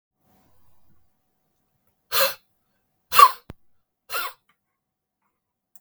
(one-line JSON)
{"exhalation_length": "5.8 s", "exhalation_amplitude": 32768, "exhalation_signal_mean_std_ratio": 0.2, "survey_phase": "beta (2021-08-13 to 2022-03-07)", "age": "45-64", "gender": "Male", "wearing_mask": "No", "symptom_new_continuous_cough": true, "symptom_runny_or_blocked_nose": true, "symptom_headache": true, "symptom_change_to_sense_of_smell_or_taste": true, "symptom_loss_of_taste": true, "smoker_status": "Current smoker (1 to 10 cigarettes per day)", "respiratory_condition_asthma": false, "respiratory_condition_other": false, "recruitment_source": "Test and Trace", "submission_delay": "2 days", "covid_test_result": "Positive", "covid_test_method": "RT-qPCR", "covid_ct_value": 18.1, "covid_ct_gene": "ORF1ab gene", "covid_ct_mean": 18.4, "covid_viral_load": "900000 copies/ml", "covid_viral_load_category": "Low viral load (10K-1M copies/ml)"}